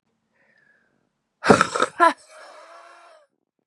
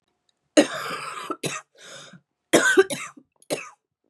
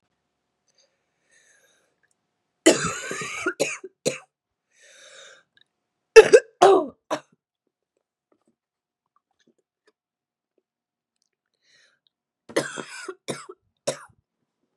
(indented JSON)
{
  "exhalation_length": "3.7 s",
  "exhalation_amplitude": 32298,
  "exhalation_signal_mean_std_ratio": 0.26,
  "cough_length": "4.1 s",
  "cough_amplitude": 29899,
  "cough_signal_mean_std_ratio": 0.36,
  "three_cough_length": "14.8 s",
  "three_cough_amplitude": 32768,
  "three_cough_signal_mean_std_ratio": 0.19,
  "survey_phase": "beta (2021-08-13 to 2022-03-07)",
  "age": "18-44",
  "gender": "Female",
  "wearing_mask": "No",
  "symptom_cough_any": true,
  "symptom_runny_or_blocked_nose": true,
  "symptom_shortness_of_breath": true,
  "symptom_sore_throat": true,
  "symptom_fatigue": true,
  "symptom_change_to_sense_of_smell_or_taste": true,
  "smoker_status": "Never smoked",
  "respiratory_condition_asthma": false,
  "respiratory_condition_other": false,
  "recruitment_source": "Test and Trace",
  "submission_delay": "-1 day",
  "covid_test_result": "Negative",
  "covid_test_method": "LFT"
}